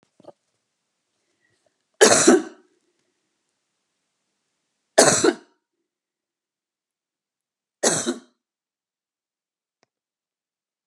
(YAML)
three_cough_length: 10.9 s
three_cough_amplitude: 32767
three_cough_signal_mean_std_ratio: 0.23
survey_phase: beta (2021-08-13 to 2022-03-07)
age: 65+
gender: Female
wearing_mask: 'No'
symptom_none: true
symptom_onset: 12 days
smoker_status: Ex-smoker
respiratory_condition_asthma: false
respiratory_condition_other: false
recruitment_source: REACT
submission_delay: 1 day
covid_test_result: Negative
covid_test_method: RT-qPCR